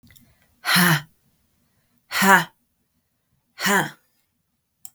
{"exhalation_length": "4.9 s", "exhalation_amplitude": 32766, "exhalation_signal_mean_std_ratio": 0.33, "survey_phase": "beta (2021-08-13 to 2022-03-07)", "age": "45-64", "gender": "Female", "wearing_mask": "No", "symptom_none": true, "smoker_status": "Ex-smoker", "respiratory_condition_asthma": false, "respiratory_condition_other": false, "recruitment_source": "REACT", "submission_delay": "4 days", "covid_test_result": "Negative", "covid_test_method": "RT-qPCR"}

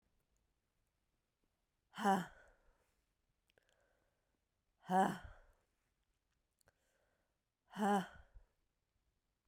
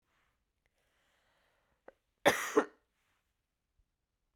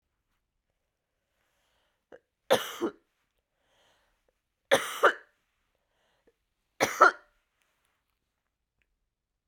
{"exhalation_length": "9.5 s", "exhalation_amplitude": 2516, "exhalation_signal_mean_std_ratio": 0.25, "cough_length": "4.4 s", "cough_amplitude": 8030, "cough_signal_mean_std_ratio": 0.19, "three_cough_length": "9.5 s", "three_cough_amplitude": 17832, "three_cough_signal_mean_std_ratio": 0.2, "survey_phase": "beta (2021-08-13 to 2022-03-07)", "age": "18-44", "gender": "Female", "wearing_mask": "No", "symptom_cough_any": true, "symptom_runny_or_blocked_nose": true, "symptom_shortness_of_breath": true, "symptom_fatigue": true, "smoker_status": "Never smoked", "respiratory_condition_asthma": false, "respiratory_condition_other": false, "recruitment_source": "Test and Trace", "submission_delay": "2 days", "covid_test_result": "Positive", "covid_test_method": "RT-qPCR", "covid_ct_value": 16.4, "covid_ct_gene": "ORF1ab gene", "covid_ct_mean": 17.5, "covid_viral_load": "1900000 copies/ml", "covid_viral_load_category": "High viral load (>1M copies/ml)"}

